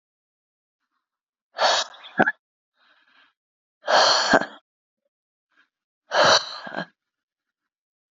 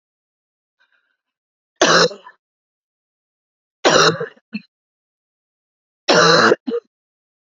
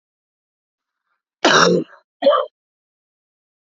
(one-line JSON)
{"exhalation_length": "8.1 s", "exhalation_amplitude": 27764, "exhalation_signal_mean_std_ratio": 0.32, "three_cough_length": "7.5 s", "three_cough_amplitude": 32767, "three_cough_signal_mean_std_ratio": 0.33, "cough_length": "3.7 s", "cough_amplitude": 31445, "cough_signal_mean_std_ratio": 0.33, "survey_phase": "alpha (2021-03-01 to 2021-08-12)", "age": "18-44", "gender": "Female", "wearing_mask": "No", "symptom_cough_any": true, "symptom_shortness_of_breath": true, "symptom_fatigue": true, "symptom_fever_high_temperature": true, "symptom_headache": true, "symptom_change_to_sense_of_smell_or_taste": true, "symptom_loss_of_taste": true, "symptom_onset": "3 days", "smoker_status": "Never smoked", "respiratory_condition_asthma": true, "respiratory_condition_other": false, "recruitment_source": "Test and Trace", "submission_delay": "2 days", "covid_test_result": "Positive", "covid_test_method": "RT-qPCR", "covid_ct_value": 12.2, "covid_ct_gene": "ORF1ab gene", "covid_ct_mean": 12.5, "covid_viral_load": "80000000 copies/ml", "covid_viral_load_category": "High viral load (>1M copies/ml)"}